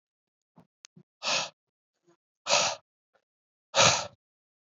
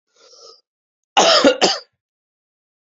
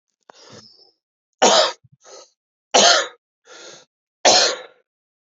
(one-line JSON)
{"exhalation_length": "4.8 s", "exhalation_amplitude": 15773, "exhalation_signal_mean_std_ratio": 0.3, "cough_length": "2.9 s", "cough_amplitude": 29983, "cough_signal_mean_std_ratio": 0.35, "three_cough_length": "5.3 s", "three_cough_amplitude": 31773, "three_cough_signal_mean_std_ratio": 0.34, "survey_phase": "beta (2021-08-13 to 2022-03-07)", "age": "18-44", "gender": "Male", "wearing_mask": "No", "symptom_new_continuous_cough": true, "symptom_runny_or_blocked_nose": true, "symptom_shortness_of_breath": true, "symptom_fatigue": true, "symptom_change_to_sense_of_smell_or_taste": true, "symptom_other": true, "symptom_onset": "3 days", "smoker_status": "Never smoked", "respiratory_condition_asthma": true, "respiratory_condition_other": false, "recruitment_source": "Test and Trace", "submission_delay": "2 days", "covid_test_result": "Positive", "covid_test_method": "RT-qPCR", "covid_ct_value": 18.2, "covid_ct_gene": "N gene", "covid_ct_mean": 19.1, "covid_viral_load": "540000 copies/ml", "covid_viral_load_category": "Low viral load (10K-1M copies/ml)"}